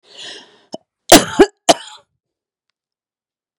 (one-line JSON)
{"three_cough_length": "3.6 s", "three_cough_amplitude": 32768, "three_cough_signal_mean_std_ratio": 0.23, "survey_phase": "beta (2021-08-13 to 2022-03-07)", "age": "45-64", "gender": "Female", "wearing_mask": "No", "symptom_cough_any": true, "symptom_runny_or_blocked_nose": true, "symptom_headache": true, "smoker_status": "Ex-smoker", "respiratory_condition_asthma": false, "respiratory_condition_other": false, "recruitment_source": "REACT", "submission_delay": "1 day", "covid_test_result": "Negative", "covid_test_method": "RT-qPCR"}